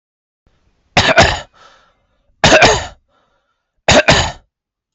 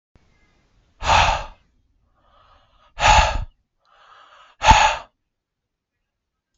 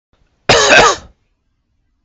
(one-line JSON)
{"three_cough_length": "4.9 s", "three_cough_amplitude": 32768, "three_cough_signal_mean_std_ratio": 0.4, "exhalation_length": "6.6 s", "exhalation_amplitude": 32768, "exhalation_signal_mean_std_ratio": 0.32, "cough_length": "2.0 s", "cough_amplitude": 32768, "cough_signal_mean_std_ratio": 0.42, "survey_phase": "beta (2021-08-13 to 2022-03-07)", "age": "18-44", "gender": "Male", "wearing_mask": "No", "symptom_none": true, "smoker_status": "Never smoked", "respiratory_condition_asthma": false, "respiratory_condition_other": false, "recruitment_source": "REACT", "submission_delay": "2 days", "covid_test_result": "Negative", "covid_test_method": "RT-qPCR", "influenza_a_test_result": "Negative", "influenza_b_test_result": "Negative"}